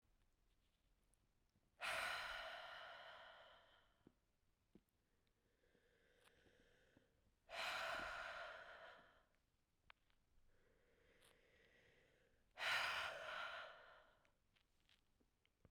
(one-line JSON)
{"exhalation_length": "15.7 s", "exhalation_amplitude": 888, "exhalation_signal_mean_std_ratio": 0.43, "survey_phase": "beta (2021-08-13 to 2022-03-07)", "age": "18-44", "gender": "Female", "wearing_mask": "No", "symptom_cough_any": true, "symptom_runny_or_blocked_nose": true, "symptom_shortness_of_breath": true, "symptom_sore_throat": true, "symptom_abdominal_pain": true, "symptom_fatigue": true, "symptom_fever_high_temperature": true, "symptom_headache": true, "symptom_change_to_sense_of_smell_or_taste": true, "symptom_onset": "6 days", "smoker_status": "Never smoked", "respiratory_condition_asthma": false, "respiratory_condition_other": false, "recruitment_source": "Test and Trace", "submission_delay": "2 days", "covid_test_result": "Positive", "covid_test_method": "RT-qPCR", "covid_ct_value": 19.3, "covid_ct_gene": "ORF1ab gene", "covid_ct_mean": 19.9, "covid_viral_load": "290000 copies/ml", "covid_viral_load_category": "Low viral load (10K-1M copies/ml)"}